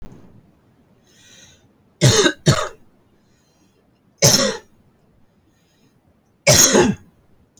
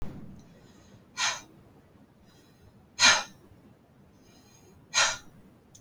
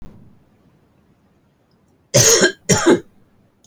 {"three_cough_length": "7.6 s", "three_cough_amplitude": 32768, "three_cough_signal_mean_std_ratio": 0.34, "exhalation_length": "5.8 s", "exhalation_amplitude": 15898, "exhalation_signal_mean_std_ratio": 0.3, "cough_length": "3.7 s", "cough_amplitude": 32747, "cough_signal_mean_std_ratio": 0.36, "survey_phase": "alpha (2021-03-01 to 2021-08-12)", "age": "18-44", "gender": "Female", "wearing_mask": "No", "symptom_none": true, "smoker_status": "Ex-smoker", "respiratory_condition_asthma": false, "respiratory_condition_other": false, "recruitment_source": "REACT", "submission_delay": "3 days", "covid_test_result": "Negative", "covid_test_method": "RT-qPCR"}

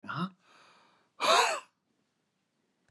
{"exhalation_length": "2.9 s", "exhalation_amplitude": 8395, "exhalation_signal_mean_std_ratio": 0.34, "survey_phase": "beta (2021-08-13 to 2022-03-07)", "age": "65+", "gender": "Male", "wearing_mask": "No", "symptom_none": true, "smoker_status": "Ex-smoker", "respiratory_condition_asthma": true, "respiratory_condition_other": false, "recruitment_source": "REACT", "submission_delay": "2 days", "covid_test_result": "Negative", "covid_test_method": "RT-qPCR", "influenza_a_test_result": "Negative", "influenza_b_test_result": "Negative"}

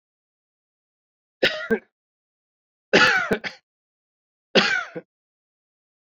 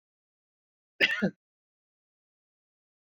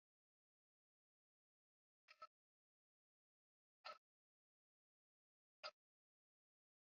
{"three_cough_length": "6.1 s", "three_cough_amplitude": 28058, "three_cough_signal_mean_std_ratio": 0.31, "cough_length": "3.1 s", "cough_amplitude": 10431, "cough_signal_mean_std_ratio": 0.21, "exhalation_length": "6.9 s", "exhalation_amplitude": 347, "exhalation_signal_mean_std_ratio": 0.14, "survey_phase": "beta (2021-08-13 to 2022-03-07)", "age": "45-64", "gender": "Male", "wearing_mask": "No", "symptom_none": true, "smoker_status": "Never smoked", "respiratory_condition_asthma": false, "respiratory_condition_other": false, "recruitment_source": "REACT", "submission_delay": "16 days", "covid_test_result": "Negative", "covid_test_method": "RT-qPCR"}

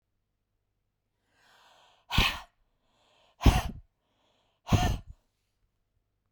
{"exhalation_length": "6.3 s", "exhalation_amplitude": 13410, "exhalation_signal_mean_std_ratio": 0.25, "survey_phase": "beta (2021-08-13 to 2022-03-07)", "age": "45-64", "gender": "Female", "wearing_mask": "No", "symptom_cough_any": true, "symptom_sore_throat": true, "symptom_fatigue": true, "smoker_status": "Never smoked", "respiratory_condition_asthma": false, "respiratory_condition_other": false, "recruitment_source": "REACT", "submission_delay": "1 day", "covid_test_result": "Negative", "covid_test_method": "RT-qPCR"}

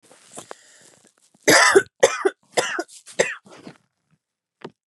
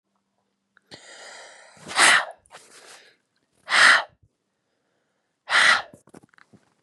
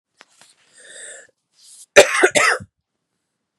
{"three_cough_length": "4.9 s", "three_cough_amplitude": 30728, "three_cough_signal_mean_std_ratio": 0.32, "exhalation_length": "6.8 s", "exhalation_amplitude": 26085, "exhalation_signal_mean_std_ratio": 0.31, "cough_length": "3.6 s", "cough_amplitude": 32768, "cough_signal_mean_std_ratio": 0.28, "survey_phase": "beta (2021-08-13 to 2022-03-07)", "age": "18-44", "gender": "Female", "wearing_mask": "No", "symptom_cough_any": true, "symptom_runny_or_blocked_nose": true, "symptom_sore_throat": true, "symptom_fever_high_temperature": true, "symptom_headache": true, "symptom_change_to_sense_of_smell_or_taste": true, "symptom_onset": "5 days", "smoker_status": "Never smoked", "respiratory_condition_asthma": false, "respiratory_condition_other": false, "recruitment_source": "Test and Trace", "submission_delay": "2 days", "covid_test_result": "Positive", "covid_test_method": "RT-qPCR", "covid_ct_value": 29.0, "covid_ct_gene": "N gene", "covid_ct_mean": 29.0, "covid_viral_load": "300 copies/ml", "covid_viral_load_category": "Minimal viral load (< 10K copies/ml)"}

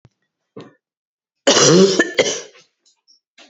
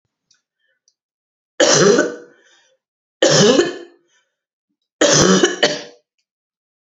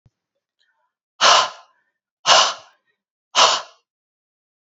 {"cough_length": "3.5 s", "cough_amplitude": 30752, "cough_signal_mean_std_ratio": 0.38, "three_cough_length": "7.0 s", "three_cough_amplitude": 32216, "three_cough_signal_mean_std_ratio": 0.41, "exhalation_length": "4.6 s", "exhalation_amplitude": 30810, "exhalation_signal_mean_std_ratio": 0.32, "survey_phase": "beta (2021-08-13 to 2022-03-07)", "age": "45-64", "gender": "Female", "wearing_mask": "No", "symptom_cough_any": true, "symptom_runny_or_blocked_nose": true, "symptom_sore_throat": true, "symptom_fatigue": true, "symptom_headache": true, "symptom_onset": "5 days", "smoker_status": "Never smoked", "respiratory_condition_asthma": false, "respiratory_condition_other": false, "recruitment_source": "Test and Trace", "submission_delay": "1 day", "covid_test_result": "Negative", "covid_test_method": "RT-qPCR"}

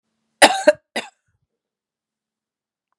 {"cough_length": "3.0 s", "cough_amplitude": 32768, "cough_signal_mean_std_ratio": 0.2, "survey_phase": "beta (2021-08-13 to 2022-03-07)", "age": "65+", "gender": "Female", "wearing_mask": "No", "symptom_cough_any": true, "symptom_runny_or_blocked_nose": true, "symptom_sore_throat": true, "symptom_diarrhoea": true, "symptom_fatigue": true, "symptom_loss_of_taste": true, "symptom_onset": "4 days", "smoker_status": "Ex-smoker", "respiratory_condition_asthma": false, "respiratory_condition_other": true, "recruitment_source": "Test and Trace", "submission_delay": "1 day", "covid_test_result": "Positive", "covid_test_method": "RT-qPCR", "covid_ct_value": 13.8, "covid_ct_gene": "N gene"}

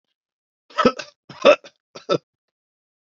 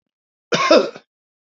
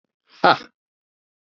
{"three_cough_length": "3.2 s", "three_cough_amplitude": 27763, "three_cough_signal_mean_std_ratio": 0.25, "cough_length": "1.5 s", "cough_amplitude": 28528, "cough_signal_mean_std_ratio": 0.37, "exhalation_length": "1.5 s", "exhalation_amplitude": 28931, "exhalation_signal_mean_std_ratio": 0.21, "survey_phase": "beta (2021-08-13 to 2022-03-07)", "age": "45-64", "gender": "Male", "wearing_mask": "No", "symptom_runny_or_blocked_nose": true, "smoker_status": "Never smoked", "respiratory_condition_asthma": false, "respiratory_condition_other": false, "recruitment_source": "REACT", "submission_delay": "1 day", "covid_test_result": "Negative", "covid_test_method": "RT-qPCR", "influenza_a_test_result": "Negative", "influenza_b_test_result": "Negative"}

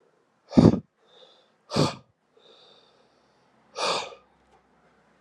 {"exhalation_length": "5.2 s", "exhalation_amplitude": 29033, "exhalation_signal_mean_std_ratio": 0.24, "survey_phase": "alpha (2021-03-01 to 2021-08-12)", "age": "18-44", "gender": "Male", "wearing_mask": "No", "symptom_cough_any": true, "symptom_new_continuous_cough": true, "symptom_fatigue": true, "symptom_onset": "2 days", "smoker_status": "Never smoked", "respiratory_condition_asthma": false, "respiratory_condition_other": false, "recruitment_source": "Test and Trace", "submission_delay": "1 day", "covid_test_result": "Positive", "covid_test_method": "RT-qPCR", "covid_ct_value": 20.4, "covid_ct_gene": "N gene", "covid_ct_mean": 20.6, "covid_viral_load": "170000 copies/ml", "covid_viral_load_category": "Low viral load (10K-1M copies/ml)"}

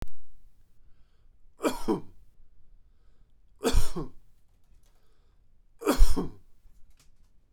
{"three_cough_length": "7.5 s", "three_cough_amplitude": 18054, "three_cough_signal_mean_std_ratio": 0.36, "survey_phase": "beta (2021-08-13 to 2022-03-07)", "age": "45-64", "gender": "Male", "wearing_mask": "No", "symptom_none": true, "smoker_status": "Never smoked", "respiratory_condition_asthma": false, "respiratory_condition_other": false, "recruitment_source": "REACT", "submission_delay": "5 days", "covid_test_result": "Negative", "covid_test_method": "RT-qPCR"}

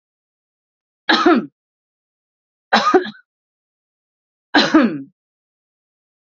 {"three_cough_length": "6.3 s", "three_cough_amplitude": 32768, "three_cough_signal_mean_std_ratio": 0.32, "survey_phase": "alpha (2021-03-01 to 2021-08-12)", "age": "18-44", "gender": "Female", "wearing_mask": "No", "symptom_none": true, "smoker_status": "Never smoked", "respiratory_condition_asthma": false, "respiratory_condition_other": false, "recruitment_source": "REACT", "submission_delay": "1 day", "covid_test_result": "Negative", "covid_test_method": "RT-qPCR"}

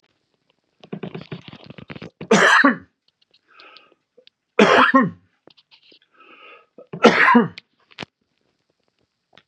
{"three_cough_length": "9.5 s", "three_cough_amplitude": 32648, "three_cough_signal_mean_std_ratio": 0.33, "survey_phase": "beta (2021-08-13 to 2022-03-07)", "age": "65+", "gender": "Male", "wearing_mask": "No", "symptom_none": true, "smoker_status": "Never smoked", "respiratory_condition_asthma": false, "respiratory_condition_other": false, "recruitment_source": "REACT", "submission_delay": "2 days", "covid_test_result": "Negative", "covid_test_method": "RT-qPCR", "influenza_a_test_result": "Unknown/Void", "influenza_b_test_result": "Unknown/Void"}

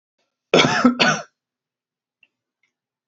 {"cough_length": "3.1 s", "cough_amplitude": 28095, "cough_signal_mean_std_ratio": 0.34, "survey_phase": "alpha (2021-03-01 to 2021-08-12)", "age": "18-44", "gender": "Male", "wearing_mask": "No", "symptom_none": true, "smoker_status": "Never smoked", "respiratory_condition_asthma": false, "respiratory_condition_other": false, "recruitment_source": "REACT", "submission_delay": "2 days", "covid_test_result": "Negative", "covid_test_method": "RT-qPCR"}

